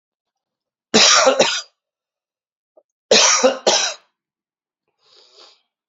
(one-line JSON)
{"cough_length": "5.9 s", "cough_amplitude": 32768, "cough_signal_mean_std_ratio": 0.38, "survey_phase": "alpha (2021-03-01 to 2021-08-12)", "age": "45-64", "gender": "Male", "wearing_mask": "No", "symptom_cough_any": true, "symptom_shortness_of_breath": true, "symptom_fatigue": true, "symptom_headache": true, "symptom_change_to_sense_of_smell_or_taste": true, "symptom_onset": "4 days", "smoker_status": "Never smoked", "respiratory_condition_asthma": false, "respiratory_condition_other": false, "recruitment_source": "Test and Trace", "submission_delay": "1 day", "covid_test_result": "Positive", "covid_test_method": "RT-qPCR", "covid_ct_value": 20.6, "covid_ct_gene": "ORF1ab gene", "covid_ct_mean": 21.1, "covid_viral_load": "120000 copies/ml", "covid_viral_load_category": "Low viral load (10K-1M copies/ml)"}